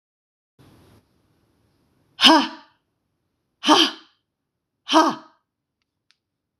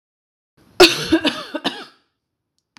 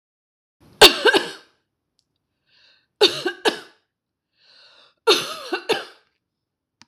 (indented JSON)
{
  "exhalation_length": "6.6 s",
  "exhalation_amplitude": 26028,
  "exhalation_signal_mean_std_ratio": 0.26,
  "cough_length": "2.8 s",
  "cough_amplitude": 26028,
  "cough_signal_mean_std_ratio": 0.31,
  "three_cough_length": "6.9 s",
  "three_cough_amplitude": 26028,
  "three_cough_signal_mean_std_ratio": 0.27,
  "survey_phase": "beta (2021-08-13 to 2022-03-07)",
  "age": "45-64",
  "gender": "Female",
  "wearing_mask": "No",
  "symptom_none": true,
  "smoker_status": "Ex-smoker",
  "respiratory_condition_asthma": false,
  "respiratory_condition_other": false,
  "recruitment_source": "REACT",
  "submission_delay": "0 days",
  "covid_test_result": "Negative",
  "covid_test_method": "RT-qPCR",
  "influenza_a_test_result": "Negative",
  "influenza_b_test_result": "Negative"
}